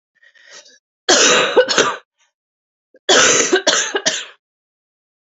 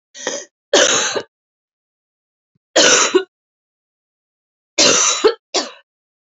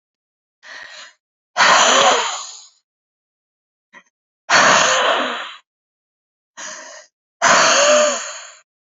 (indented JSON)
{
  "cough_length": "5.3 s",
  "cough_amplitude": 32261,
  "cough_signal_mean_std_ratio": 0.48,
  "three_cough_length": "6.4 s",
  "three_cough_amplitude": 32767,
  "three_cough_signal_mean_std_ratio": 0.4,
  "exhalation_length": "9.0 s",
  "exhalation_amplitude": 32158,
  "exhalation_signal_mean_std_ratio": 0.47,
  "survey_phase": "alpha (2021-03-01 to 2021-08-12)",
  "age": "18-44",
  "gender": "Female",
  "wearing_mask": "No",
  "symptom_cough_any": true,
  "symptom_shortness_of_breath": true,
  "symptom_fatigue": true,
  "symptom_fever_high_temperature": true,
  "symptom_change_to_sense_of_smell_or_taste": true,
  "symptom_loss_of_taste": true,
  "symptom_onset": "3 days",
  "smoker_status": "Ex-smoker",
  "respiratory_condition_asthma": false,
  "respiratory_condition_other": false,
  "recruitment_source": "Test and Trace",
  "submission_delay": "1 day",
  "covid_test_result": "Positive",
  "covid_test_method": "RT-qPCR"
}